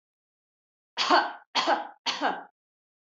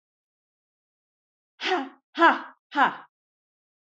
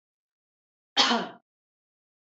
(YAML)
three_cough_length: 3.1 s
three_cough_amplitude: 13601
three_cough_signal_mean_std_ratio: 0.41
exhalation_length: 3.8 s
exhalation_amplitude: 17065
exhalation_signal_mean_std_ratio: 0.29
cough_length: 2.4 s
cough_amplitude: 15669
cough_signal_mean_std_ratio: 0.26
survey_phase: alpha (2021-03-01 to 2021-08-12)
age: 45-64
gender: Female
wearing_mask: 'No'
symptom_none: true
smoker_status: Never smoked
respiratory_condition_asthma: false
respiratory_condition_other: false
recruitment_source: REACT
submission_delay: 1 day
covid_test_result: Negative
covid_test_method: RT-qPCR